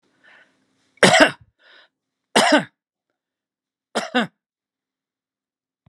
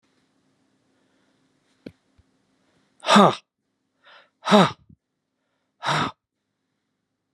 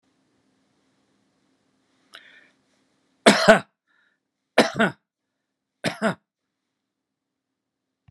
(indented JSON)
{
  "cough_length": "5.9 s",
  "cough_amplitude": 32767,
  "cough_signal_mean_std_ratio": 0.26,
  "exhalation_length": "7.3 s",
  "exhalation_amplitude": 30886,
  "exhalation_signal_mean_std_ratio": 0.23,
  "three_cough_length": "8.1 s",
  "three_cough_amplitude": 32767,
  "three_cough_signal_mean_std_ratio": 0.2,
  "survey_phase": "beta (2021-08-13 to 2022-03-07)",
  "age": "65+",
  "gender": "Male",
  "wearing_mask": "No",
  "symptom_none": true,
  "symptom_onset": "13 days",
  "smoker_status": "Ex-smoker",
  "respiratory_condition_asthma": false,
  "respiratory_condition_other": false,
  "recruitment_source": "REACT",
  "submission_delay": "2 days",
  "covid_test_result": "Negative",
  "covid_test_method": "RT-qPCR",
  "influenza_a_test_result": "Negative",
  "influenza_b_test_result": "Negative"
}